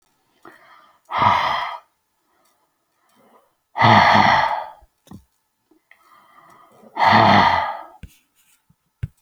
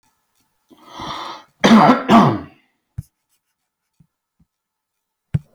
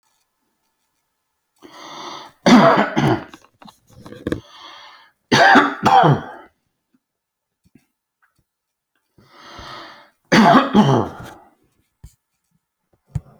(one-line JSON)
{"exhalation_length": "9.2 s", "exhalation_amplitude": 28820, "exhalation_signal_mean_std_ratio": 0.4, "cough_length": "5.5 s", "cough_amplitude": 29648, "cough_signal_mean_std_ratio": 0.31, "three_cough_length": "13.4 s", "three_cough_amplitude": 29861, "three_cough_signal_mean_std_ratio": 0.35, "survey_phase": "alpha (2021-03-01 to 2021-08-12)", "age": "45-64", "gender": "Male", "wearing_mask": "No", "symptom_none": true, "smoker_status": "Ex-smoker", "respiratory_condition_asthma": false, "respiratory_condition_other": false, "recruitment_source": "REACT", "submission_delay": "2 days", "covid_test_result": "Negative", "covid_test_method": "RT-qPCR"}